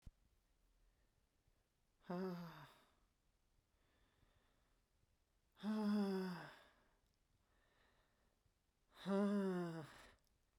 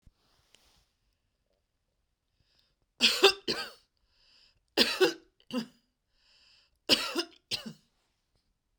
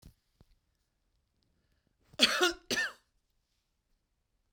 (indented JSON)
{
  "exhalation_length": "10.6 s",
  "exhalation_amplitude": 1177,
  "exhalation_signal_mean_std_ratio": 0.4,
  "three_cough_length": "8.8 s",
  "three_cough_amplitude": 14257,
  "three_cough_signal_mean_std_ratio": 0.27,
  "cough_length": "4.5 s",
  "cough_amplitude": 12897,
  "cough_signal_mean_std_ratio": 0.25,
  "survey_phase": "beta (2021-08-13 to 2022-03-07)",
  "age": "45-64",
  "gender": "Female",
  "wearing_mask": "No",
  "symptom_none": true,
  "smoker_status": "Ex-smoker",
  "respiratory_condition_asthma": false,
  "respiratory_condition_other": false,
  "recruitment_source": "REACT",
  "submission_delay": "2 days",
  "covid_test_result": "Negative",
  "covid_test_method": "RT-qPCR"
}